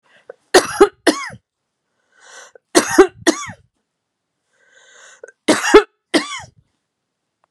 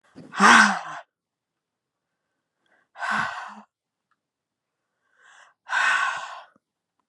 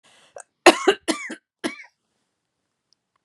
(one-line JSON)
{"three_cough_length": "7.5 s", "three_cough_amplitude": 32768, "three_cough_signal_mean_std_ratio": 0.28, "exhalation_length": "7.1 s", "exhalation_amplitude": 28004, "exhalation_signal_mean_std_ratio": 0.31, "cough_length": "3.2 s", "cough_amplitude": 32767, "cough_signal_mean_std_ratio": 0.22, "survey_phase": "beta (2021-08-13 to 2022-03-07)", "age": "65+", "gender": "Female", "wearing_mask": "No", "symptom_none": true, "smoker_status": "Never smoked", "respiratory_condition_asthma": false, "respiratory_condition_other": false, "recruitment_source": "REACT", "submission_delay": "1 day", "covid_test_result": "Negative", "covid_test_method": "RT-qPCR", "influenza_a_test_result": "Negative", "influenza_b_test_result": "Negative"}